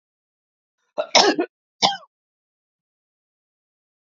{"cough_length": "4.1 s", "cough_amplitude": 32090, "cough_signal_mean_std_ratio": 0.24, "survey_phase": "alpha (2021-03-01 to 2021-08-12)", "age": "45-64", "gender": "Female", "wearing_mask": "No", "symptom_none": true, "smoker_status": "Never smoked", "respiratory_condition_asthma": false, "respiratory_condition_other": false, "recruitment_source": "REACT", "submission_delay": "1 day", "covid_test_result": "Negative", "covid_test_method": "RT-qPCR"}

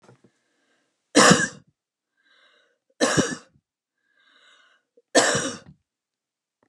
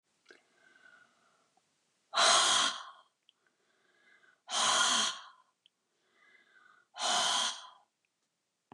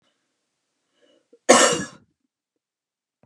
{"three_cough_length": "6.7 s", "three_cough_amplitude": 29544, "three_cough_signal_mean_std_ratio": 0.28, "exhalation_length": "8.7 s", "exhalation_amplitude": 6958, "exhalation_signal_mean_std_ratio": 0.39, "cough_length": "3.3 s", "cough_amplitude": 32672, "cough_signal_mean_std_ratio": 0.23, "survey_phase": "beta (2021-08-13 to 2022-03-07)", "age": "45-64", "gender": "Female", "wearing_mask": "No", "symptom_other": true, "smoker_status": "Ex-smoker", "respiratory_condition_asthma": false, "respiratory_condition_other": false, "recruitment_source": "Test and Trace", "submission_delay": "2 days", "covid_test_result": "Negative", "covid_test_method": "RT-qPCR"}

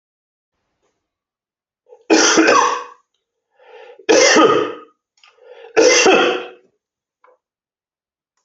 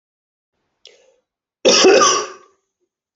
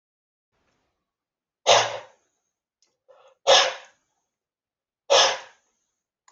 {"three_cough_length": "8.4 s", "three_cough_amplitude": 29570, "three_cough_signal_mean_std_ratio": 0.41, "cough_length": "3.2 s", "cough_amplitude": 28193, "cough_signal_mean_std_ratio": 0.37, "exhalation_length": "6.3 s", "exhalation_amplitude": 23265, "exhalation_signal_mean_std_ratio": 0.27, "survey_phase": "beta (2021-08-13 to 2022-03-07)", "age": "45-64", "gender": "Male", "wearing_mask": "No", "symptom_none": true, "smoker_status": "Never smoked", "respiratory_condition_asthma": false, "respiratory_condition_other": false, "recruitment_source": "REACT", "submission_delay": "1 day", "covid_test_result": "Negative", "covid_test_method": "RT-qPCR"}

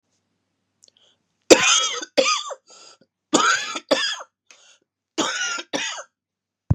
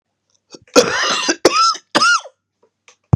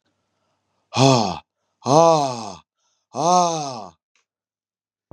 {"three_cough_length": "6.7 s", "three_cough_amplitude": 32768, "three_cough_signal_mean_std_ratio": 0.39, "cough_length": "3.2 s", "cough_amplitude": 32768, "cough_signal_mean_std_ratio": 0.48, "exhalation_length": "5.1 s", "exhalation_amplitude": 31505, "exhalation_signal_mean_std_ratio": 0.39, "survey_phase": "beta (2021-08-13 to 2022-03-07)", "age": "45-64", "gender": "Male", "wearing_mask": "No", "symptom_cough_any": true, "symptom_runny_or_blocked_nose": true, "symptom_sore_throat": true, "smoker_status": "Never smoked", "respiratory_condition_asthma": false, "respiratory_condition_other": false, "recruitment_source": "Test and Trace", "submission_delay": "2 days", "covid_test_result": "Positive", "covid_test_method": "RT-qPCR", "covid_ct_value": 21.5, "covid_ct_gene": "ORF1ab gene"}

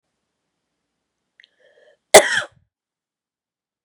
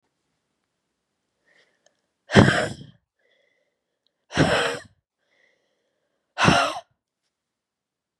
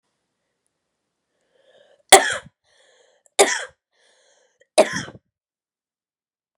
{"cough_length": "3.8 s", "cough_amplitude": 32768, "cough_signal_mean_std_ratio": 0.16, "exhalation_length": "8.2 s", "exhalation_amplitude": 31598, "exhalation_signal_mean_std_ratio": 0.27, "three_cough_length": "6.6 s", "three_cough_amplitude": 32768, "three_cough_signal_mean_std_ratio": 0.2, "survey_phase": "beta (2021-08-13 to 2022-03-07)", "age": "18-44", "gender": "Female", "wearing_mask": "No", "symptom_cough_any": true, "symptom_runny_or_blocked_nose": true, "symptom_sore_throat": true, "symptom_onset": "4 days", "smoker_status": "Never smoked", "respiratory_condition_asthma": false, "respiratory_condition_other": false, "recruitment_source": "Test and Trace", "submission_delay": "1 day", "covid_test_result": "Positive", "covid_test_method": "RT-qPCR", "covid_ct_value": 16.2, "covid_ct_gene": "ORF1ab gene", "covid_ct_mean": 16.6, "covid_viral_load": "3600000 copies/ml", "covid_viral_load_category": "High viral load (>1M copies/ml)"}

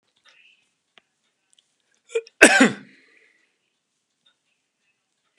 {"cough_length": "5.4 s", "cough_amplitude": 32768, "cough_signal_mean_std_ratio": 0.18, "survey_phase": "beta (2021-08-13 to 2022-03-07)", "age": "65+", "gender": "Male", "wearing_mask": "No", "symptom_none": true, "smoker_status": "Ex-smoker", "respiratory_condition_asthma": false, "respiratory_condition_other": false, "recruitment_source": "REACT", "submission_delay": "2 days", "covid_test_result": "Negative", "covid_test_method": "RT-qPCR", "influenza_a_test_result": "Negative", "influenza_b_test_result": "Negative"}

